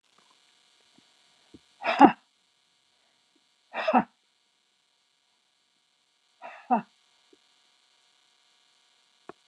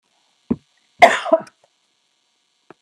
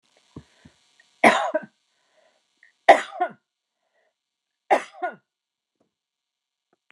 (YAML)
exhalation_length: 9.5 s
exhalation_amplitude: 29160
exhalation_signal_mean_std_ratio: 0.17
cough_length: 2.8 s
cough_amplitude: 29204
cough_signal_mean_std_ratio: 0.23
three_cough_length: 6.9 s
three_cough_amplitude: 29204
three_cough_signal_mean_std_ratio: 0.21
survey_phase: alpha (2021-03-01 to 2021-08-12)
age: 65+
gender: Female
wearing_mask: 'No'
symptom_none: true
smoker_status: Never smoked
respiratory_condition_asthma: false
respiratory_condition_other: false
recruitment_source: REACT
submission_delay: 1 day
covid_test_result: Negative
covid_test_method: RT-qPCR